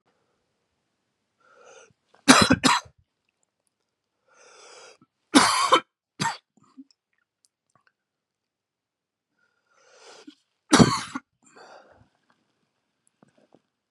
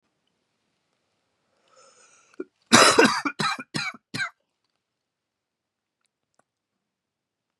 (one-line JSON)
{"three_cough_length": "13.9 s", "three_cough_amplitude": 32192, "three_cough_signal_mean_std_ratio": 0.22, "cough_length": "7.6 s", "cough_amplitude": 32308, "cough_signal_mean_std_ratio": 0.24, "survey_phase": "beta (2021-08-13 to 2022-03-07)", "age": "45-64", "gender": "Male", "wearing_mask": "No", "symptom_cough_any": true, "symptom_new_continuous_cough": true, "symptom_shortness_of_breath": true, "symptom_sore_throat": true, "symptom_fatigue": true, "symptom_fever_high_temperature": true, "symptom_headache": true, "smoker_status": "Ex-smoker", "respiratory_condition_asthma": false, "respiratory_condition_other": false, "recruitment_source": "Test and Trace", "submission_delay": "2 days", "covid_test_result": "Positive", "covid_test_method": "RT-qPCR", "covid_ct_value": 23.0, "covid_ct_gene": "ORF1ab gene"}